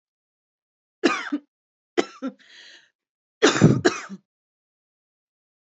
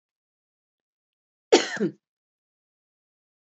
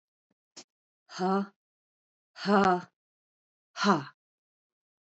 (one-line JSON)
{"three_cough_length": "5.7 s", "three_cough_amplitude": 26992, "three_cough_signal_mean_std_ratio": 0.28, "cough_length": "3.5 s", "cough_amplitude": 23507, "cough_signal_mean_std_ratio": 0.19, "exhalation_length": "5.1 s", "exhalation_amplitude": 11648, "exhalation_signal_mean_std_ratio": 0.32, "survey_phase": "beta (2021-08-13 to 2022-03-07)", "age": "45-64", "gender": "Female", "wearing_mask": "No", "symptom_cough_any": true, "symptom_new_continuous_cough": true, "symptom_shortness_of_breath": true, "symptom_fatigue": true, "symptom_fever_high_temperature": true, "symptom_headache": true, "symptom_change_to_sense_of_smell_or_taste": true, "symptom_other": true, "symptom_onset": "5 days", "smoker_status": "Never smoked", "respiratory_condition_asthma": true, "respiratory_condition_other": false, "recruitment_source": "Test and Trace", "submission_delay": "2 days", "covid_test_result": "Positive", "covid_test_method": "RT-qPCR"}